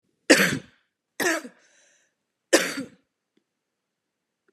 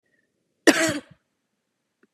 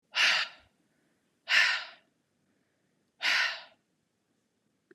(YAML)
three_cough_length: 4.5 s
three_cough_amplitude: 27682
three_cough_signal_mean_std_ratio: 0.28
cough_length: 2.1 s
cough_amplitude: 32743
cough_signal_mean_std_ratio: 0.25
exhalation_length: 4.9 s
exhalation_amplitude: 9474
exhalation_signal_mean_std_ratio: 0.36
survey_phase: beta (2021-08-13 to 2022-03-07)
age: 18-44
gender: Female
wearing_mask: 'No'
symptom_cough_any: true
symptom_runny_or_blocked_nose: true
symptom_sore_throat: true
symptom_fatigue: true
symptom_onset: 1 day
smoker_status: Never smoked
respiratory_condition_asthma: false
respiratory_condition_other: false
recruitment_source: Test and Trace
submission_delay: 1 day
covid_test_result: Positive
covid_test_method: RT-qPCR
covid_ct_value: 27.4
covid_ct_gene: ORF1ab gene
covid_ct_mean: 27.5
covid_viral_load: 960 copies/ml
covid_viral_load_category: Minimal viral load (< 10K copies/ml)